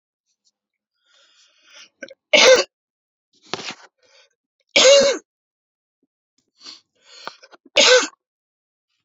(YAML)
three_cough_length: 9.0 s
three_cough_amplitude: 32767
three_cough_signal_mean_std_ratio: 0.28
survey_phase: beta (2021-08-13 to 2022-03-07)
age: 18-44
gender: Male
wearing_mask: 'No'
symptom_cough_any: true
symptom_new_continuous_cough: true
symptom_runny_or_blocked_nose: true
symptom_fatigue: true
symptom_fever_high_temperature: true
symptom_onset: 10 days
smoker_status: Current smoker (e-cigarettes or vapes only)
respiratory_condition_asthma: false
respiratory_condition_other: false
recruitment_source: Test and Trace
submission_delay: 0 days
covid_test_result: Positive
covid_test_method: ePCR